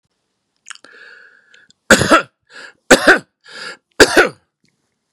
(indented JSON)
{
  "cough_length": "5.1 s",
  "cough_amplitude": 32768,
  "cough_signal_mean_std_ratio": 0.31,
  "survey_phase": "beta (2021-08-13 to 2022-03-07)",
  "age": "65+",
  "gender": "Male",
  "wearing_mask": "No",
  "symptom_cough_any": true,
  "symptom_runny_or_blocked_nose": true,
  "smoker_status": "Never smoked",
  "respiratory_condition_asthma": false,
  "respiratory_condition_other": false,
  "recruitment_source": "REACT",
  "submission_delay": "3 days",
  "covid_test_result": "Negative",
  "covid_test_method": "RT-qPCR",
  "influenza_a_test_result": "Negative",
  "influenza_b_test_result": "Negative"
}